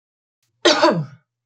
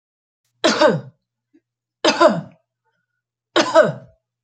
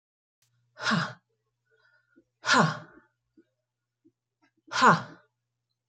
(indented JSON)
{
  "cough_length": "1.5 s",
  "cough_amplitude": 29121,
  "cough_signal_mean_std_ratio": 0.41,
  "three_cough_length": "4.4 s",
  "three_cough_amplitude": 29582,
  "three_cough_signal_mean_std_ratio": 0.37,
  "exhalation_length": "5.9 s",
  "exhalation_amplitude": 14537,
  "exhalation_signal_mean_std_ratio": 0.28,
  "survey_phase": "beta (2021-08-13 to 2022-03-07)",
  "age": "45-64",
  "gender": "Female",
  "wearing_mask": "No",
  "symptom_none": true,
  "smoker_status": "Ex-smoker",
  "respiratory_condition_asthma": false,
  "respiratory_condition_other": false,
  "recruitment_source": "REACT",
  "submission_delay": "2 days",
  "covid_test_result": "Negative",
  "covid_test_method": "RT-qPCR"
}